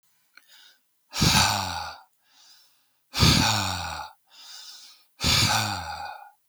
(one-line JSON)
{"exhalation_length": "6.5 s", "exhalation_amplitude": 17750, "exhalation_signal_mean_std_ratio": 0.49, "survey_phase": "beta (2021-08-13 to 2022-03-07)", "age": "45-64", "gender": "Male", "wearing_mask": "No", "symptom_none": true, "smoker_status": "Never smoked", "respiratory_condition_asthma": false, "respiratory_condition_other": false, "recruitment_source": "REACT", "submission_delay": "1 day", "covid_test_result": "Negative", "covid_test_method": "RT-qPCR"}